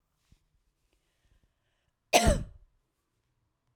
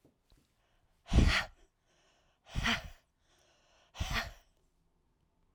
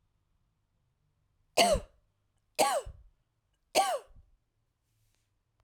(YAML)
cough_length: 3.8 s
cough_amplitude: 16505
cough_signal_mean_std_ratio: 0.21
exhalation_length: 5.5 s
exhalation_amplitude: 7917
exhalation_signal_mean_std_ratio: 0.3
three_cough_length: 5.6 s
three_cough_amplitude: 11296
three_cough_signal_mean_std_ratio: 0.29
survey_phase: alpha (2021-03-01 to 2021-08-12)
age: 45-64
gender: Female
wearing_mask: 'No'
symptom_none: true
smoker_status: Never smoked
respiratory_condition_asthma: false
respiratory_condition_other: false
recruitment_source: REACT
submission_delay: 1 day
covid_test_result: Negative
covid_test_method: RT-qPCR